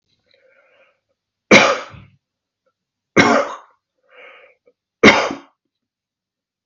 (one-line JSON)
{"three_cough_length": "6.7 s", "three_cough_amplitude": 32768, "three_cough_signal_mean_std_ratio": 0.27, "survey_phase": "beta (2021-08-13 to 2022-03-07)", "age": "45-64", "gender": "Male", "wearing_mask": "No", "symptom_none": true, "smoker_status": "Never smoked", "respiratory_condition_asthma": false, "respiratory_condition_other": false, "recruitment_source": "REACT", "submission_delay": "1 day", "covid_test_result": "Negative", "covid_test_method": "RT-qPCR", "influenza_a_test_result": "Negative", "influenza_b_test_result": "Negative"}